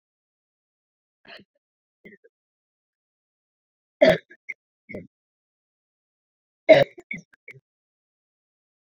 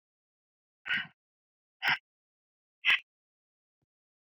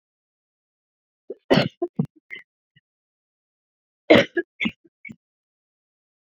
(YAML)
three_cough_length: 8.9 s
three_cough_amplitude: 26456
three_cough_signal_mean_std_ratio: 0.15
exhalation_length: 4.4 s
exhalation_amplitude: 7255
exhalation_signal_mean_std_ratio: 0.23
cough_length: 6.4 s
cough_amplitude: 28021
cough_signal_mean_std_ratio: 0.21
survey_phase: beta (2021-08-13 to 2022-03-07)
age: 18-44
gender: Female
wearing_mask: 'No'
symptom_cough_any: true
symptom_runny_or_blocked_nose: true
symptom_fatigue: true
symptom_headache: true
symptom_change_to_sense_of_smell_or_taste: true
symptom_loss_of_taste: true
symptom_other: true
symptom_onset: 5 days
smoker_status: Never smoked
respiratory_condition_asthma: false
respiratory_condition_other: false
recruitment_source: Test and Trace
submission_delay: 1 day
covid_test_result: Positive
covid_test_method: RT-qPCR
covid_ct_value: 17.5
covid_ct_gene: ORF1ab gene
covid_ct_mean: 17.9
covid_viral_load: 1300000 copies/ml
covid_viral_load_category: High viral load (>1M copies/ml)